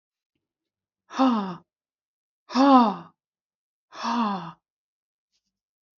{"exhalation_length": "6.0 s", "exhalation_amplitude": 20421, "exhalation_signal_mean_std_ratio": 0.32, "survey_phase": "beta (2021-08-13 to 2022-03-07)", "age": "18-44", "gender": "Female", "wearing_mask": "No", "symptom_runny_or_blocked_nose": true, "smoker_status": "Never smoked", "respiratory_condition_asthma": false, "respiratory_condition_other": false, "recruitment_source": "Test and Trace", "submission_delay": "0 days", "covid_test_result": "Negative", "covid_test_method": "LFT"}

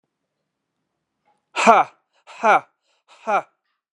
{"exhalation_length": "3.9 s", "exhalation_amplitude": 32767, "exhalation_signal_mean_std_ratio": 0.29, "survey_phase": "beta (2021-08-13 to 2022-03-07)", "age": "45-64", "gender": "Male", "wearing_mask": "No", "symptom_none": true, "smoker_status": "Never smoked", "respiratory_condition_asthma": false, "respiratory_condition_other": false, "recruitment_source": "REACT", "submission_delay": "1 day", "covid_test_result": "Negative", "covid_test_method": "RT-qPCR"}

